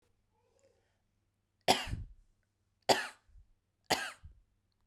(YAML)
three_cough_length: 4.9 s
three_cough_amplitude: 10034
three_cough_signal_mean_std_ratio: 0.25
survey_phase: beta (2021-08-13 to 2022-03-07)
age: 18-44
gender: Female
wearing_mask: 'No'
symptom_runny_or_blocked_nose: true
symptom_sore_throat: true
smoker_status: Never smoked
respiratory_condition_asthma: false
respiratory_condition_other: false
recruitment_source: Test and Trace
submission_delay: 1 day
covid_test_result: Positive
covid_test_method: RT-qPCR
covid_ct_value: 32.6
covid_ct_gene: ORF1ab gene
covid_ct_mean: 34.4
covid_viral_load: 5.3 copies/ml
covid_viral_load_category: Minimal viral load (< 10K copies/ml)